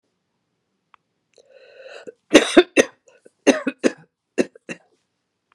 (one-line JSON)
{"three_cough_length": "5.5 s", "three_cough_amplitude": 32768, "three_cough_signal_mean_std_ratio": 0.23, "survey_phase": "beta (2021-08-13 to 2022-03-07)", "age": "65+", "gender": "Female", "wearing_mask": "No", "symptom_none": true, "smoker_status": "Never smoked", "respiratory_condition_asthma": false, "respiratory_condition_other": false, "recruitment_source": "REACT", "submission_delay": "30 days", "covid_test_result": "Negative", "covid_test_method": "RT-qPCR"}